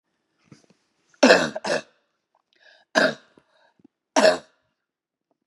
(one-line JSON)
{"three_cough_length": "5.5 s", "three_cough_amplitude": 32768, "three_cough_signal_mean_std_ratio": 0.28, "survey_phase": "beta (2021-08-13 to 2022-03-07)", "age": "45-64", "gender": "Female", "wearing_mask": "No", "symptom_cough_any": true, "symptom_runny_or_blocked_nose": true, "symptom_sore_throat": true, "symptom_headache": true, "symptom_onset": "4 days", "smoker_status": "Never smoked", "respiratory_condition_asthma": false, "respiratory_condition_other": false, "recruitment_source": "Test and Trace", "submission_delay": "2 days", "covid_test_result": "Positive", "covid_test_method": "RT-qPCR", "covid_ct_value": 14.7, "covid_ct_gene": "ORF1ab gene"}